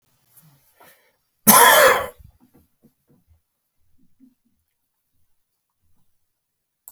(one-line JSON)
{"cough_length": "6.9 s", "cough_amplitude": 32768, "cough_signal_mean_std_ratio": 0.23, "survey_phase": "beta (2021-08-13 to 2022-03-07)", "age": "65+", "gender": "Male", "wearing_mask": "No", "symptom_none": true, "symptom_onset": "12 days", "smoker_status": "Ex-smoker", "respiratory_condition_asthma": false, "respiratory_condition_other": false, "recruitment_source": "REACT", "submission_delay": "1 day", "covid_test_result": "Negative", "covid_test_method": "RT-qPCR"}